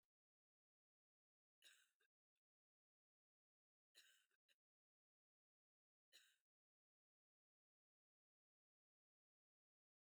{
  "three_cough_length": "10.0 s",
  "three_cough_amplitude": 55,
  "three_cough_signal_mean_std_ratio": 0.2,
  "survey_phase": "beta (2021-08-13 to 2022-03-07)",
  "age": "18-44",
  "gender": "Female",
  "wearing_mask": "No",
  "symptom_none": true,
  "smoker_status": "Current smoker (11 or more cigarettes per day)",
  "respiratory_condition_asthma": false,
  "respiratory_condition_other": false,
  "recruitment_source": "REACT",
  "submission_delay": "1 day",
  "covid_test_result": "Negative",
  "covid_test_method": "RT-qPCR",
  "influenza_a_test_result": "Negative",
  "influenza_b_test_result": "Negative"
}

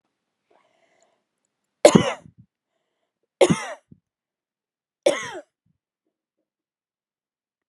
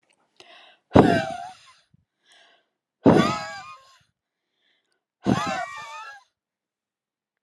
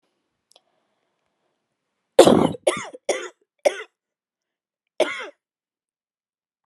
{
  "three_cough_length": "7.7 s",
  "three_cough_amplitude": 32768,
  "three_cough_signal_mean_std_ratio": 0.18,
  "exhalation_length": "7.4 s",
  "exhalation_amplitude": 32767,
  "exhalation_signal_mean_std_ratio": 0.29,
  "cough_length": "6.7 s",
  "cough_amplitude": 32768,
  "cough_signal_mean_std_ratio": 0.23,
  "survey_phase": "beta (2021-08-13 to 2022-03-07)",
  "age": "18-44",
  "gender": "Female",
  "wearing_mask": "No",
  "symptom_fatigue": true,
  "symptom_headache": true,
  "smoker_status": "Never smoked",
  "respiratory_condition_asthma": false,
  "respiratory_condition_other": false,
  "recruitment_source": "REACT",
  "submission_delay": "1 day",
  "covid_test_result": "Negative",
  "covid_test_method": "RT-qPCR",
  "influenza_a_test_result": "Negative",
  "influenza_b_test_result": "Negative"
}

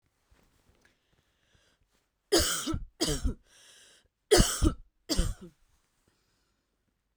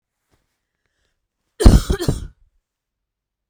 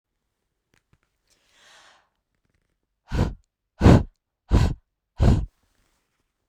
{
  "three_cough_length": "7.2 s",
  "three_cough_amplitude": 13056,
  "three_cough_signal_mean_std_ratio": 0.32,
  "cough_length": "3.5 s",
  "cough_amplitude": 32768,
  "cough_signal_mean_std_ratio": 0.24,
  "exhalation_length": "6.5 s",
  "exhalation_amplitude": 32600,
  "exhalation_signal_mean_std_ratio": 0.27,
  "survey_phase": "beta (2021-08-13 to 2022-03-07)",
  "age": "18-44",
  "gender": "Female",
  "wearing_mask": "No",
  "symptom_cough_any": true,
  "symptom_runny_or_blocked_nose": true,
  "symptom_sore_throat": true,
  "symptom_headache": true,
  "symptom_onset": "2 days",
  "smoker_status": "Never smoked",
  "respiratory_condition_asthma": false,
  "respiratory_condition_other": false,
  "recruitment_source": "Test and Trace",
  "submission_delay": "2 days",
  "covid_test_result": "Positive",
  "covid_test_method": "RT-qPCR",
  "covid_ct_value": 36.6,
  "covid_ct_gene": "ORF1ab gene"
}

